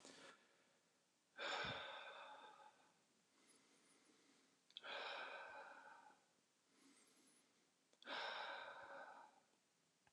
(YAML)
exhalation_length: 10.1 s
exhalation_amplitude: 615
exhalation_signal_mean_std_ratio: 0.53
survey_phase: beta (2021-08-13 to 2022-03-07)
age: 18-44
gender: Male
wearing_mask: 'No'
symptom_none: true
smoker_status: Never smoked
respiratory_condition_asthma: false
respiratory_condition_other: false
recruitment_source: REACT
submission_delay: 1 day
covid_test_result: Negative
covid_test_method: RT-qPCR
influenza_a_test_result: Negative
influenza_b_test_result: Negative